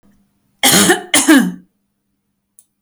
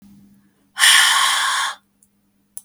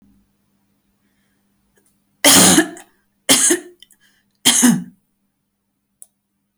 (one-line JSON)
{"cough_length": "2.8 s", "cough_amplitude": 32768, "cough_signal_mean_std_ratio": 0.43, "exhalation_length": "2.6 s", "exhalation_amplitude": 32768, "exhalation_signal_mean_std_ratio": 0.49, "three_cough_length": "6.6 s", "three_cough_amplitude": 32768, "three_cough_signal_mean_std_ratio": 0.33, "survey_phase": "beta (2021-08-13 to 2022-03-07)", "age": "65+", "gender": "Female", "wearing_mask": "No", "symptom_none": true, "smoker_status": "Never smoked", "respiratory_condition_asthma": false, "respiratory_condition_other": false, "recruitment_source": "REACT", "submission_delay": "2 days", "covid_test_result": "Negative", "covid_test_method": "RT-qPCR", "influenza_a_test_result": "Negative", "influenza_b_test_result": "Negative"}